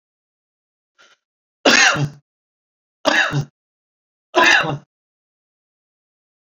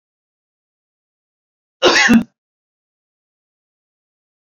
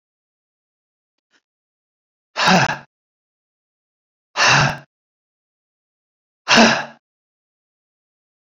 {"three_cough_length": "6.5 s", "three_cough_amplitude": 32229, "three_cough_signal_mean_std_ratio": 0.33, "cough_length": "4.4 s", "cough_amplitude": 29840, "cough_signal_mean_std_ratio": 0.24, "exhalation_length": "8.4 s", "exhalation_amplitude": 32768, "exhalation_signal_mean_std_ratio": 0.28, "survey_phase": "beta (2021-08-13 to 2022-03-07)", "age": "65+", "gender": "Male", "wearing_mask": "No", "symptom_none": true, "smoker_status": "Never smoked", "respiratory_condition_asthma": false, "respiratory_condition_other": false, "recruitment_source": "REACT", "submission_delay": "1 day", "covid_test_result": "Negative", "covid_test_method": "RT-qPCR", "influenza_a_test_result": "Negative", "influenza_b_test_result": "Negative"}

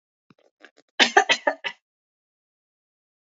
{"cough_length": "3.3 s", "cough_amplitude": 25518, "cough_signal_mean_std_ratio": 0.23, "survey_phase": "alpha (2021-03-01 to 2021-08-12)", "age": "45-64", "gender": "Female", "wearing_mask": "No", "symptom_none": true, "smoker_status": "Never smoked", "respiratory_condition_asthma": false, "respiratory_condition_other": false, "recruitment_source": "Test and Trace", "submission_delay": "-1 day", "covid_test_result": "Negative", "covid_test_method": "LFT"}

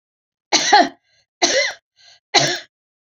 {"three_cough_length": "3.2 s", "three_cough_amplitude": 29773, "three_cough_signal_mean_std_ratio": 0.4, "survey_phase": "beta (2021-08-13 to 2022-03-07)", "age": "65+", "gender": "Female", "wearing_mask": "No", "symptom_none": true, "smoker_status": "Never smoked", "respiratory_condition_asthma": false, "respiratory_condition_other": false, "recruitment_source": "REACT", "submission_delay": "6 days", "covid_test_result": "Negative", "covid_test_method": "RT-qPCR"}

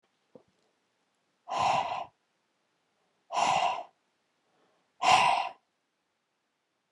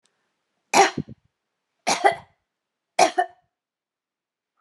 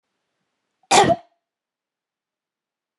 {"exhalation_length": "6.9 s", "exhalation_amplitude": 12431, "exhalation_signal_mean_std_ratio": 0.36, "three_cough_length": "4.6 s", "three_cough_amplitude": 25246, "three_cough_signal_mean_std_ratio": 0.27, "cough_length": "3.0 s", "cough_amplitude": 29698, "cough_signal_mean_std_ratio": 0.23, "survey_phase": "beta (2021-08-13 to 2022-03-07)", "age": "45-64", "gender": "Female", "wearing_mask": "No", "symptom_none": true, "smoker_status": "Never smoked", "respiratory_condition_asthma": false, "respiratory_condition_other": false, "recruitment_source": "REACT", "submission_delay": "2 days", "covid_test_result": "Negative", "covid_test_method": "RT-qPCR"}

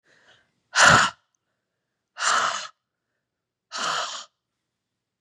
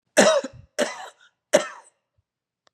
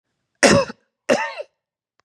{"exhalation_length": "5.2 s", "exhalation_amplitude": 27981, "exhalation_signal_mean_std_ratio": 0.33, "three_cough_length": "2.7 s", "three_cough_amplitude": 25427, "three_cough_signal_mean_std_ratio": 0.33, "cough_length": "2.0 s", "cough_amplitude": 31806, "cough_signal_mean_std_ratio": 0.35, "survey_phase": "beta (2021-08-13 to 2022-03-07)", "age": "45-64", "gender": "Female", "wearing_mask": "No", "symptom_cough_any": true, "symptom_runny_or_blocked_nose": true, "symptom_sore_throat": true, "symptom_diarrhoea": true, "symptom_fatigue": true, "symptom_onset": "6 days", "smoker_status": "Never smoked", "respiratory_condition_asthma": false, "respiratory_condition_other": false, "recruitment_source": "Test and Trace", "submission_delay": "1 day", "covid_test_result": "Positive", "covid_test_method": "RT-qPCR", "covid_ct_value": 21.2, "covid_ct_gene": "N gene"}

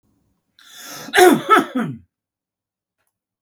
{"cough_length": "3.4 s", "cough_amplitude": 32768, "cough_signal_mean_std_ratio": 0.33, "survey_phase": "beta (2021-08-13 to 2022-03-07)", "age": "65+", "gender": "Male", "wearing_mask": "No", "symptom_none": true, "smoker_status": "Ex-smoker", "respiratory_condition_asthma": false, "respiratory_condition_other": false, "recruitment_source": "REACT", "submission_delay": "10 days", "covid_test_result": "Negative", "covid_test_method": "RT-qPCR"}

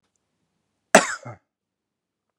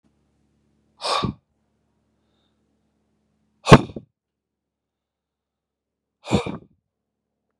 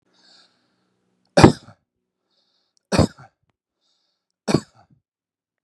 {"cough_length": "2.4 s", "cough_amplitude": 32768, "cough_signal_mean_std_ratio": 0.17, "exhalation_length": "7.6 s", "exhalation_amplitude": 32768, "exhalation_signal_mean_std_ratio": 0.16, "three_cough_length": "5.6 s", "three_cough_amplitude": 32768, "three_cough_signal_mean_std_ratio": 0.18, "survey_phase": "beta (2021-08-13 to 2022-03-07)", "age": "45-64", "gender": "Male", "wearing_mask": "No", "symptom_none": true, "smoker_status": "Ex-smoker", "respiratory_condition_asthma": false, "respiratory_condition_other": false, "recruitment_source": "REACT", "submission_delay": "8 days", "covid_test_result": "Negative", "covid_test_method": "RT-qPCR"}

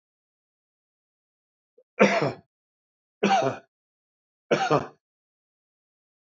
{"three_cough_length": "6.4 s", "three_cough_amplitude": 19713, "three_cough_signal_mean_std_ratio": 0.29, "survey_phase": "beta (2021-08-13 to 2022-03-07)", "age": "65+", "gender": "Male", "wearing_mask": "No", "symptom_none": true, "smoker_status": "Ex-smoker", "respiratory_condition_asthma": false, "respiratory_condition_other": false, "recruitment_source": "REACT", "submission_delay": "2 days", "covid_test_result": "Negative", "covid_test_method": "RT-qPCR", "influenza_a_test_result": "Negative", "influenza_b_test_result": "Negative"}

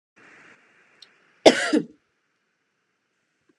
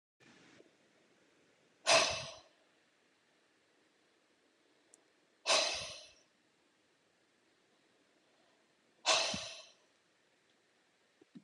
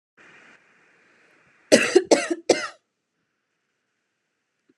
{"cough_length": "3.6 s", "cough_amplitude": 32767, "cough_signal_mean_std_ratio": 0.2, "exhalation_length": "11.4 s", "exhalation_amplitude": 5759, "exhalation_signal_mean_std_ratio": 0.26, "three_cough_length": "4.8 s", "three_cough_amplitude": 31346, "three_cough_signal_mean_std_ratio": 0.25, "survey_phase": "beta (2021-08-13 to 2022-03-07)", "age": "18-44", "gender": "Female", "wearing_mask": "No", "symptom_fatigue": true, "smoker_status": "Never smoked", "respiratory_condition_asthma": false, "respiratory_condition_other": false, "recruitment_source": "REACT", "submission_delay": "1 day", "covid_test_result": "Negative", "covid_test_method": "RT-qPCR"}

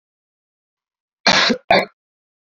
{"cough_length": "2.6 s", "cough_amplitude": 30309, "cough_signal_mean_std_ratio": 0.32, "survey_phase": "beta (2021-08-13 to 2022-03-07)", "age": "18-44", "gender": "Male", "wearing_mask": "No", "symptom_fatigue": true, "smoker_status": "Never smoked", "respiratory_condition_asthma": false, "respiratory_condition_other": false, "recruitment_source": "Test and Trace", "submission_delay": "12 days", "covid_test_result": "Negative", "covid_test_method": "RT-qPCR"}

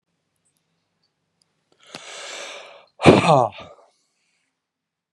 {"exhalation_length": "5.1 s", "exhalation_amplitude": 32767, "exhalation_signal_mean_std_ratio": 0.24, "survey_phase": "beta (2021-08-13 to 2022-03-07)", "age": "45-64", "gender": "Male", "wearing_mask": "No", "symptom_cough_any": true, "symptom_sore_throat": true, "symptom_fatigue": true, "symptom_headache": true, "symptom_onset": "2 days", "smoker_status": "Never smoked", "respiratory_condition_asthma": false, "respiratory_condition_other": false, "recruitment_source": "Test and Trace", "submission_delay": "1 day", "covid_test_result": "Positive", "covid_test_method": "ePCR"}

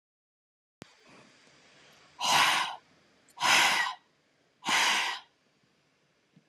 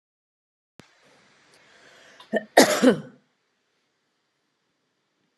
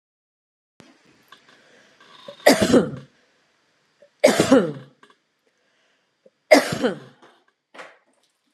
{"exhalation_length": "6.5 s", "exhalation_amplitude": 11052, "exhalation_signal_mean_std_ratio": 0.41, "cough_length": "5.4 s", "cough_amplitude": 29652, "cough_signal_mean_std_ratio": 0.21, "three_cough_length": "8.5 s", "three_cough_amplitude": 32767, "three_cough_signal_mean_std_ratio": 0.28, "survey_phase": "beta (2021-08-13 to 2022-03-07)", "age": "45-64", "gender": "Female", "wearing_mask": "No", "symptom_none": true, "symptom_onset": "13 days", "smoker_status": "Never smoked", "respiratory_condition_asthma": false, "respiratory_condition_other": false, "recruitment_source": "REACT", "submission_delay": "2 days", "covid_test_result": "Negative", "covid_test_method": "RT-qPCR"}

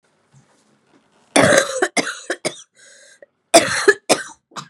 {"cough_length": "4.7 s", "cough_amplitude": 32768, "cough_signal_mean_std_ratio": 0.37, "survey_phase": "beta (2021-08-13 to 2022-03-07)", "age": "18-44", "gender": "Female", "wearing_mask": "No", "symptom_cough_any": true, "symptom_runny_or_blocked_nose": true, "symptom_fatigue": true, "symptom_headache": true, "symptom_change_to_sense_of_smell_or_taste": true, "smoker_status": "Ex-smoker", "respiratory_condition_asthma": false, "respiratory_condition_other": false, "recruitment_source": "Test and Trace", "submission_delay": "2 days", "covid_test_result": "Positive", "covid_test_method": "RT-qPCR", "covid_ct_value": 20.8, "covid_ct_gene": "ORF1ab gene", "covid_ct_mean": 21.0, "covid_viral_load": "130000 copies/ml", "covid_viral_load_category": "Low viral load (10K-1M copies/ml)"}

